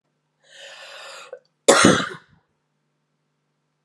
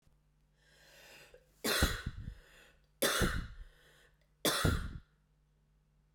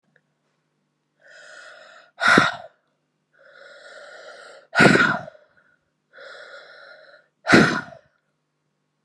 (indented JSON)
{
  "cough_length": "3.8 s",
  "cough_amplitude": 32767,
  "cough_signal_mean_std_ratio": 0.26,
  "three_cough_length": "6.1 s",
  "three_cough_amplitude": 7157,
  "three_cough_signal_mean_std_ratio": 0.41,
  "exhalation_length": "9.0 s",
  "exhalation_amplitude": 32594,
  "exhalation_signal_mean_std_ratio": 0.29,
  "survey_phase": "beta (2021-08-13 to 2022-03-07)",
  "age": "18-44",
  "gender": "Female",
  "wearing_mask": "No",
  "symptom_cough_any": true,
  "symptom_runny_or_blocked_nose": true,
  "symptom_shortness_of_breath": true,
  "symptom_sore_throat": true,
  "symptom_fatigue": true,
  "symptom_headache": true,
  "symptom_change_to_sense_of_smell_or_taste": true,
  "smoker_status": "Never smoked",
  "respiratory_condition_asthma": false,
  "respiratory_condition_other": false,
  "recruitment_source": "Test and Trace",
  "submission_delay": "2 days",
  "covid_test_result": "Positive",
  "covid_test_method": "RT-qPCR",
  "covid_ct_value": 20.9,
  "covid_ct_gene": "ORF1ab gene",
  "covid_ct_mean": 21.3,
  "covid_viral_load": "100000 copies/ml",
  "covid_viral_load_category": "Low viral load (10K-1M copies/ml)"
}